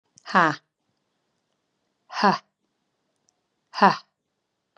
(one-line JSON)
{"exhalation_length": "4.8 s", "exhalation_amplitude": 28428, "exhalation_signal_mean_std_ratio": 0.23, "survey_phase": "beta (2021-08-13 to 2022-03-07)", "age": "45-64", "gender": "Female", "wearing_mask": "No", "symptom_none": true, "smoker_status": "Never smoked", "respiratory_condition_asthma": true, "respiratory_condition_other": false, "recruitment_source": "REACT", "submission_delay": "2 days", "covid_test_result": "Negative", "covid_test_method": "RT-qPCR"}